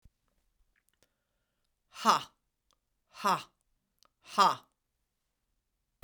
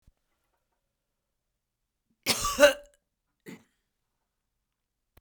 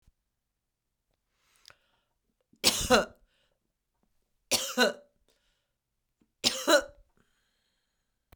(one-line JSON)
{"exhalation_length": "6.0 s", "exhalation_amplitude": 10342, "exhalation_signal_mean_std_ratio": 0.22, "cough_length": "5.2 s", "cough_amplitude": 19158, "cough_signal_mean_std_ratio": 0.19, "three_cough_length": "8.4 s", "three_cough_amplitude": 15072, "three_cough_signal_mean_std_ratio": 0.25, "survey_phase": "beta (2021-08-13 to 2022-03-07)", "age": "65+", "gender": "Female", "wearing_mask": "No", "symptom_cough_any": true, "symptom_runny_or_blocked_nose": true, "symptom_fatigue": true, "symptom_headache": true, "symptom_onset": "3 days", "smoker_status": "Never smoked", "respiratory_condition_asthma": false, "respiratory_condition_other": false, "recruitment_source": "Test and Trace", "submission_delay": "1 day", "covid_test_result": "Positive", "covid_test_method": "RT-qPCR", "covid_ct_value": 25.5, "covid_ct_gene": "N gene"}